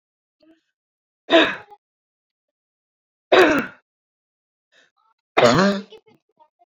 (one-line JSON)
{"three_cough_length": "6.7 s", "three_cough_amplitude": 27270, "three_cough_signal_mean_std_ratio": 0.3, "survey_phase": "beta (2021-08-13 to 2022-03-07)", "age": "18-44", "gender": "Female", "wearing_mask": "No", "symptom_abdominal_pain": true, "symptom_fatigue": true, "smoker_status": "Never smoked", "respiratory_condition_asthma": false, "respiratory_condition_other": false, "recruitment_source": "REACT", "submission_delay": "2 days", "covid_test_result": "Negative", "covid_test_method": "RT-qPCR"}